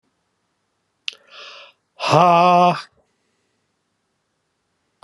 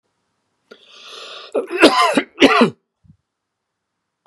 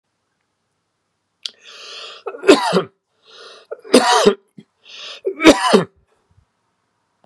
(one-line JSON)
{"exhalation_length": "5.0 s", "exhalation_amplitude": 31757, "exhalation_signal_mean_std_ratio": 0.31, "cough_length": "4.3 s", "cough_amplitude": 32768, "cough_signal_mean_std_ratio": 0.35, "three_cough_length": "7.3 s", "three_cough_amplitude": 32768, "three_cough_signal_mean_std_ratio": 0.32, "survey_phase": "beta (2021-08-13 to 2022-03-07)", "age": "45-64", "gender": "Male", "wearing_mask": "No", "symptom_none": true, "smoker_status": "Ex-smoker", "respiratory_condition_asthma": false, "respiratory_condition_other": false, "recruitment_source": "REACT", "submission_delay": "2 days", "covid_test_result": "Negative", "covid_test_method": "RT-qPCR", "influenza_a_test_result": "Negative", "influenza_b_test_result": "Negative"}